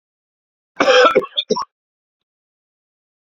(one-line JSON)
{"cough_length": "3.2 s", "cough_amplitude": 29967, "cough_signal_mean_std_ratio": 0.33, "survey_phase": "beta (2021-08-13 to 2022-03-07)", "age": "45-64", "gender": "Male", "wearing_mask": "No", "symptom_runny_or_blocked_nose": true, "symptom_fatigue": true, "symptom_fever_high_temperature": true, "symptom_headache": true, "symptom_onset": "2 days", "smoker_status": "Never smoked", "respiratory_condition_asthma": true, "respiratory_condition_other": false, "recruitment_source": "Test and Trace", "submission_delay": "2 days", "covid_test_result": "Positive", "covid_test_method": "RT-qPCR", "covid_ct_value": 27.5, "covid_ct_gene": "ORF1ab gene", "covid_ct_mean": 28.1, "covid_viral_load": "580 copies/ml", "covid_viral_load_category": "Minimal viral load (< 10K copies/ml)"}